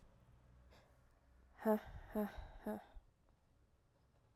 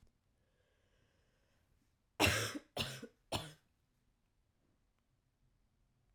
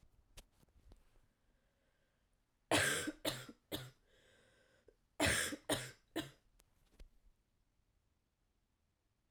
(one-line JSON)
{"exhalation_length": "4.4 s", "exhalation_amplitude": 1995, "exhalation_signal_mean_std_ratio": 0.34, "three_cough_length": "6.1 s", "three_cough_amplitude": 5198, "three_cough_signal_mean_std_ratio": 0.25, "cough_length": "9.3 s", "cough_amplitude": 3291, "cough_signal_mean_std_ratio": 0.31, "survey_phase": "alpha (2021-03-01 to 2021-08-12)", "age": "18-44", "gender": "Female", "wearing_mask": "No", "symptom_cough_any": true, "symptom_new_continuous_cough": true, "symptom_fatigue": true, "symptom_headache": true, "symptom_change_to_sense_of_smell_or_taste": true, "symptom_loss_of_taste": true, "symptom_onset": "3 days", "smoker_status": "Never smoked", "respiratory_condition_asthma": false, "respiratory_condition_other": false, "recruitment_source": "Test and Trace", "submission_delay": "2 days", "covid_test_result": "Positive", "covid_test_method": "RT-qPCR"}